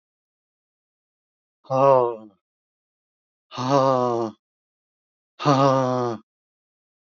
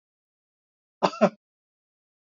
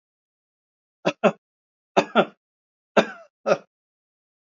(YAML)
exhalation_length: 7.1 s
exhalation_amplitude: 19894
exhalation_signal_mean_std_ratio: 0.39
cough_length: 2.4 s
cough_amplitude: 19699
cough_signal_mean_std_ratio: 0.18
three_cough_length: 4.5 s
three_cough_amplitude: 28768
three_cough_signal_mean_std_ratio: 0.24
survey_phase: alpha (2021-03-01 to 2021-08-12)
age: 65+
gender: Male
wearing_mask: 'No'
symptom_none: true
smoker_status: Never smoked
respiratory_condition_asthma: false
respiratory_condition_other: false
recruitment_source: REACT
submission_delay: 1 day
covid_test_result: Negative
covid_test_method: RT-qPCR